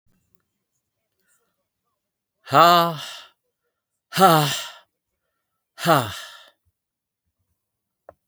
{
  "exhalation_length": "8.3 s",
  "exhalation_amplitude": 31379,
  "exhalation_signal_mean_std_ratio": 0.28,
  "survey_phase": "beta (2021-08-13 to 2022-03-07)",
  "age": "45-64",
  "gender": "Male",
  "wearing_mask": "No",
  "symptom_none": true,
  "smoker_status": "Never smoked",
  "respiratory_condition_asthma": false,
  "respiratory_condition_other": false,
  "recruitment_source": "REACT",
  "submission_delay": "2 days",
  "covid_test_result": "Negative",
  "covid_test_method": "RT-qPCR",
  "influenza_a_test_result": "Negative",
  "influenza_b_test_result": "Negative"
}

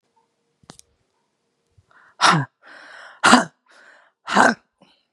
{
  "exhalation_length": "5.1 s",
  "exhalation_amplitude": 32768,
  "exhalation_signal_mean_std_ratio": 0.29,
  "survey_phase": "beta (2021-08-13 to 2022-03-07)",
  "age": "45-64",
  "gender": "Female",
  "wearing_mask": "No",
  "symptom_cough_any": true,
  "symptom_runny_or_blocked_nose": true,
  "symptom_fatigue": true,
  "smoker_status": "Never smoked",
  "respiratory_condition_asthma": false,
  "respiratory_condition_other": false,
  "recruitment_source": "Test and Trace",
  "submission_delay": "2 days",
  "covid_test_result": "Positive",
  "covid_test_method": "RT-qPCR",
  "covid_ct_value": 25.0,
  "covid_ct_gene": "ORF1ab gene"
}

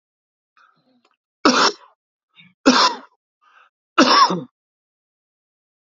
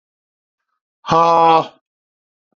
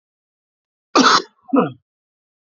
{
  "three_cough_length": "5.9 s",
  "three_cough_amplitude": 30181,
  "three_cough_signal_mean_std_ratio": 0.32,
  "exhalation_length": "2.6 s",
  "exhalation_amplitude": 28056,
  "exhalation_signal_mean_std_ratio": 0.37,
  "cough_length": "2.5 s",
  "cough_amplitude": 28691,
  "cough_signal_mean_std_ratio": 0.33,
  "survey_phase": "alpha (2021-03-01 to 2021-08-12)",
  "age": "45-64",
  "gender": "Male",
  "wearing_mask": "No",
  "symptom_cough_any": true,
  "symptom_fatigue": true,
  "symptom_headache": true,
  "symptom_change_to_sense_of_smell_or_taste": true,
  "symptom_onset": "4 days",
  "smoker_status": "Ex-smoker",
  "respiratory_condition_asthma": false,
  "respiratory_condition_other": false,
  "recruitment_source": "Test and Trace",
  "submission_delay": "3 days",
  "covid_test_result": "Positive",
  "covid_test_method": "RT-qPCR",
  "covid_ct_value": 16.5,
  "covid_ct_gene": "ORF1ab gene",
  "covid_ct_mean": 17.2,
  "covid_viral_load": "2200000 copies/ml",
  "covid_viral_load_category": "High viral load (>1M copies/ml)"
}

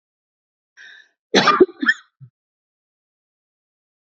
{
  "cough_length": "4.2 s",
  "cough_amplitude": 30464,
  "cough_signal_mean_std_ratio": 0.24,
  "survey_phase": "alpha (2021-03-01 to 2021-08-12)",
  "age": "45-64",
  "gender": "Female",
  "wearing_mask": "No",
  "symptom_none": true,
  "smoker_status": "Ex-smoker",
  "respiratory_condition_asthma": false,
  "respiratory_condition_other": false,
  "recruitment_source": "REACT",
  "submission_delay": "2 days",
  "covid_test_result": "Negative",
  "covid_test_method": "RT-qPCR"
}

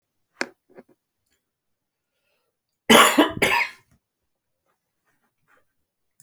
{
  "cough_length": "6.2 s",
  "cough_amplitude": 30488,
  "cough_signal_mean_std_ratio": 0.24,
  "survey_phase": "beta (2021-08-13 to 2022-03-07)",
  "age": "65+",
  "gender": "Male",
  "wearing_mask": "No",
  "symptom_cough_any": true,
  "smoker_status": "Never smoked",
  "respiratory_condition_asthma": false,
  "respiratory_condition_other": false,
  "recruitment_source": "REACT",
  "submission_delay": "3 days",
  "covid_test_result": "Negative",
  "covid_test_method": "RT-qPCR"
}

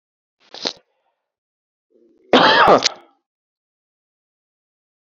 {
  "cough_length": "5.0 s",
  "cough_amplitude": 32768,
  "cough_signal_mean_std_ratio": 0.27,
  "survey_phase": "beta (2021-08-13 to 2022-03-07)",
  "age": "45-64",
  "gender": "Male",
  "wearing_mask": "No",
  "symptom_cough_any": true,
  "symptom_runny_or_blocked_nose": true,
  "symptom_sore_throat": true,
  "symptom_fatigue": true,
  "symptom_onset": "11 days",
  "smoker_status": "Ex-smoker",
  "respiratory_condition_asthma": false,
  "respiratory_condition_other": false,
  "recruitment_source": "REACT",
  "submission_delay": "1 day",
  "covid_test_result": "Negative",
  "covid_test_method": "RT-qPCR"
}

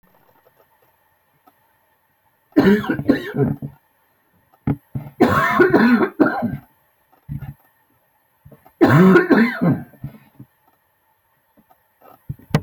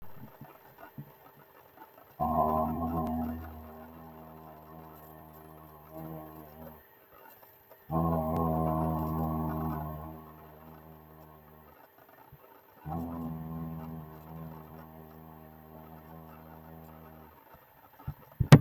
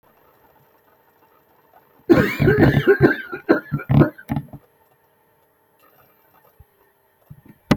{
  "three_cough_length": "12.6 s",
  "three_cough_amplitude": 26800,
  "three_cough_signal_mean_std_ratio": 0.4,
  "exhalation_length": "18.6 s",
  "exhalation_amplitude": 26420,
  "exhalation_signal_mean_std_ratio": 0.37,
  "cough_length": "7.8 s",
  "cough_amplitude": 26788,
  "cough_signal_mean_std_ratio": 0.35,
  "survey_phase": "alpha (2021-03-01 to 2021-08-12)",
  "age": "45-64",
  "gender": "Male",
  "wearing_mask": "No",
  "symptom_headache": true,
  "smoker_status": "Never smoked",
  "respiratory_condition_asthma": false,
  "respiratory_condition_other": false,
  "recruitment_source": "REACT",
  "submission_delay": "1 day",
  "covid_test_result": "Negative",
  "covid_test_method": "RT-qPCR"
}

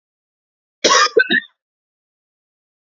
{
  "cough_length": "2.9 s",
  "cough_amplitude": 32094,
  "cough_signal_mean_std_ratio": 0.31,
  "survey_phase": "beta (2021-08-13 to 2022-03-07)",
  "age": "18-44",
  "gender": "Female",
  "wearing_mask": "No",
  "symptom_none": true,
  "symptom_onset": "10 days",
  "smoker_status": "Ex-smoker",
  "respiratory_condition_asthma": true,
  "respiratory_condition_other": false,
  "recruitment_source": "REACT",
  "submission_delay": "2 days",
  "covid_test_result": "Negative",
  "covid_test_method": "RT-qPCR",
  "influenza_a_test_result": "Unknown/Void",
  "influenza_b_test_result": "Unknown/Void"
}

